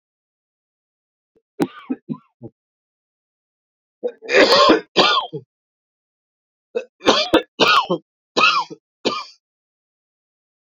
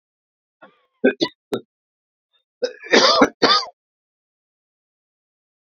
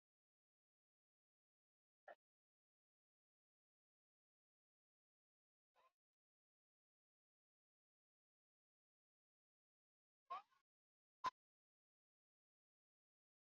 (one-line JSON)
{"three_cough_length": "10.8 s", "three_cough_amplitude": 32767, "three_cough_signal_mean_std_ratio": 0.35, "cough_length": "5.7 s", "cough_amplitude": 30507, "cough_signal_mean_std_ratio": 0.3, "exhalation_length": "13.5 s", "exhalation_amplitude": 581, "exhalation_signal_mean_std_ratio": 0.09, "survey_phase": "beta (2021-08-13 to 2022-03-07)", "age": "45-64", "gender": "Male", "wearing_mask": "No", "symptom_cough_any": true, "symptom_runny_or_blocked_nose": true, "symptom_sore_throat": true, "symptom_onset": "3 days", "smoker_status": "Never smoked", "respiratory_condition_asthma": false, "respiratory_condition_other": false, "recruitment_source": "REACT", "submission_delay": "0 days", "covid_test_result": "Negative", "covid_test_method": "RT-qPCR", "influenza_a_test_result": "Negative", "influenza_b_test_result": "Negative"}